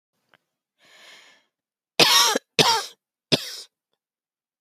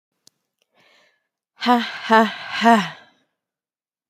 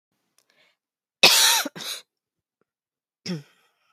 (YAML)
three_cough_length: 4.6 s
three_cough_amplitude: 29982
three_cough_signal_mean_std_ratio: 0.31
exhalation_length: 4.1 s
exhalation_amplitude: 26789
exhalation_signal_mean_std_ratio: 0.34
cough_length: 3.9 s
cough_amplitude: 30060
cough_signal_mean_std_ratio: 0.29
survey_phase: beta (2021-08-13 to 2022-03-07)
age: 45-64
gender: Female
wearing_mask: 'No'
symptom_runny_or_blocked_nose: true
symptom_shortness_of_breath: true
symptom_abdominal_pain: true
symptom_fatigue: true
symptom_fever_high_temperature: true
symptom_onset: 8 days
smoker_status: Never smoked
respiratory_condition_asthma: false
respiratory_condition_other: false
recruitment_source: REACT
submission_delay: 1 day
covid_test_result: Positive
covid_test_method: RT-qPCR
covid_ct_value: 27.0
covid_ct_gene: E gene
influenza_a_test_result: Negative
influenza_b_test_result: Negative